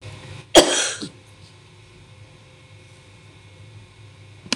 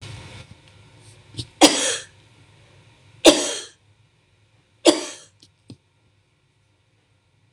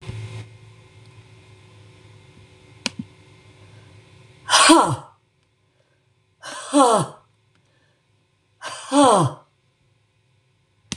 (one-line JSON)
{"cough_length": "4.6 s", "cough_amplitude": 26028, "cough_signal_mean_std_ratio": 0.27, "three_cough_length": "7.5 s", "three_cough_amplitude": 26028, "three_cough_signal_mean_std_ratio": 0.24, "exhalation_length": "11.0 s", "exhalation_amplitude": 26027, "exhalation_signal_mean_std_ratio": 0.3, "survey_phase": "beta (2021-08-13 to 2022-03-07)", "age": "65+", "gender": "Female", "wearing_mask": "No", "symptom_none": true, "smoker_status": "Ex-smoker", "respiratory_condition_asthma": true, "respiratory_condition_other": false, "recruitment_source": "REACT", "submission_delay": "-1 day", "covid_test_result": "Negative", "covid_test_method": "RT-qPCR", "influenza_a_test_result": "Negative", "influenza_b_test_result": "Negative"}